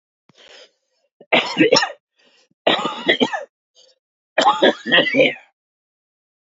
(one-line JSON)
{"three_cough_length": "6.6 s", "three_cough_amplitude": 32330, "three_cough_signal_mean_std_ratio": 0.4, "survey_phase": "alpha (2021-03-01 to 2021-08-12)", "age": "45-64", "gender": "Male", "wearing_mask": "Yes", "symptom_cough_any": true, "symptom_fatigue": true, "symptom_fever_high_temperature": true, "symptom_headache": true, "symptom_change_to_sense_of_smell_or_taste": true, "symptom_onset": "4 days", "smoker_status": "Current smoker (e-cigarettes or vapes only)", "respiratory_condition_asthma": false, "respiratory_condition_other": false, "recruitment_source": "Test and Trace", "submission_delay": "2 days", "covid_test_result": "Positive", "covid_test_method": "RT-qPCR", "covid_ct_value": 17.2, "covid_ct_gene": "ORF1ab gene", "covid_ct_mean": 17.2, "covid_viral_load": "2400000 copies/ml", "covid_viral_load_category": "High viral load (>1M copies/ml)"}